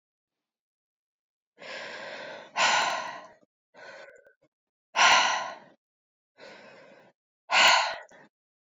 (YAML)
exhalation_length: 8.7 s
exhalation_amplitude: 15666
exhalation_signal_mean_std_ratio: 0.35
survey_phase: alpha (2021-03-01 to 2021-08-12)
age: 18-44
gender: Female
wearing_mask: 'No'
symptom_cough_any: true
symptom_fatigue: true
symptom_fever_high_temperature: true
symptom_headache: true
symptom_onset: 3 days
smoker_status: Never smoked
respiratory_condition_asthma: false
respiratory_condition_other: false
recruitment_source: Test and Trace
submission_delay: 2 days
covid_test_result: Positive
covid_test_method: RT-qPCR
covid_ct_value: 19.5
covid_ct_gene: ORF1ab gene
covid_ct_mean: 20.6
covid_viral_load: 170000 copies/ml
covid_viral_load_category: Low viral load (10K-1M copies/ml)